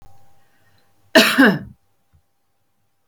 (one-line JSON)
{"cough_length": "3.1 s", "cough_amplitude": 30701, "cough_signal_mean_std_ratio": 0.3, "survey_phase": "beta (2021-08-13 to 2022-03-07)", "age": "65+", "gender": "Female", "wearing_mask": "No", "symptom_none": true, "smoker_status": "Never smoked", "respiratory_condition_asthma": false, "respiratory_condition_other": false, "recruitment_source": "REACT", "submission_delay": "1 day", "covid_test_result": "Negative", "covid_test_method": "RT-qPCR"}